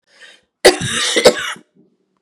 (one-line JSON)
{"cough_length": "2.2 s", "cough_amplitude": 32768, "cough_signal_mean_std_ratio": 0.4, "survey_phase": "beta (2021-08-13 to 2022-03-07)", "age": "45-64", "gender": "Female", "wearing_mask": "No", "symptom_runny_or_blocked_nose": true, "symptom_sore_throat": true, "symptom_fatigue": true, "symptom_headache": true, "smoker_status": "Ex-smoker", "respiratory_condition_asthma": true, "respiratory_condition_other": false, "recruitment_source": "Test and Trace", "submission_delay": "1 day", "covid_test_result": "Positive", "covid_test_method": "ePCR"}